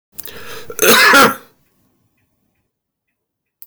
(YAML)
cough_length: 3.7 s
cough_amplitude: 32768
cough_signal_mean_std_ratio: 0.37
survey_phase: beta (2021-08-13 to 2022-03-07)
age: 45-64
gender: Male
wearing_mask: 'No'
symptom_none: true
smoker_status: Ex-smoker
respiratory_condition_asthma: false
respiratory_condition_other: false
recruitment_source: REACT
submission_delay: 2 days
covid_test_result: Negative
covid_test_method: RT-qPCR
influenza_a_test_result: Negative
influenza_b_test_result: Negative